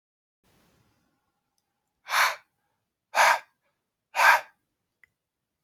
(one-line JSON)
{"exhalation_length": "5.6 s", "exhalation_amplitude": 18323, "exhalation_signal_mean_std_ratio": 0.27, "survey_phase": "alpha (2021-03-01 to 2021-08-12)", "age": "18-44", "gender": "Male", "wearing_mask": "No", "symptom_cough_any": true, "symptom_fatigue": true, "symptom_headache": true, "symptom_change_to_sense_of_smell_or_taste": true, "symptom_loss_of_taste": true, "symptom_onset": "3 days", "smoker_status": "Never smoked", "respiratory_condition_asthma": false, "respiratory_condition_other": false, "recruitment_source": "Test and Trace", "submission_delay": "2 days", "covid_test_result": "Positive", "covid_test_method": "RT-qPCR", "covid_ct_value": 21.1, "covid_ct_gene": "ORF1ab gene", "covid_ct_mean": 21.8, "covid_viral_load": "73000 copies/ml", "covid_viral_load_category": "Low viral load (10K-1M copies/ml)"}